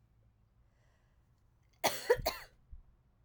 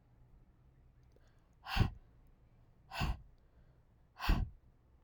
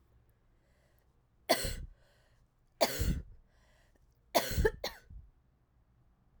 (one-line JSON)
{"cough_length": "3.2 s", "cough_amplitude": 5744, "cough_signal_mean_std_ratio": 0.27, "exhalation_length": "5.0 s", "exhalation_amplitude": 4190, "exhalation_signal_mean_std_ratio": 0.32, "three_cough_length": "6.4 s", "three_cough_amplitude": 8088, "three_cough_signal_mean_std_ratio": 0.33, "survey_phase": "alpha (2021-03-01 to 2021-08-12)", "age": "18-44", "gender": "Female", "wearing_mask": "No", "symptom_cough_any": true, "symptom_fatigue": true, "symptom_fever_high_temperature": true, "symptom_change_to_sense_of_smell_or_taste": true, "smoker_status": "Ex-smoker", "respiratory_condition_asthma": false, "respiratory_condition_other": false, "recruitment_source": "Test and Trace", "submission_delay": "2 days", "covid_test_result": "Positive", "covid_test_method": "RT-qPCR", "covid_ct_value": 18.9, "covid_ct_gene": "ORF1ab gene", "covid_ct_mean": 19.3, "covid_viral_load": "470000 copies/ml", "covid_viral_load_category": "Low viral load (10K-1M copies/ml)"}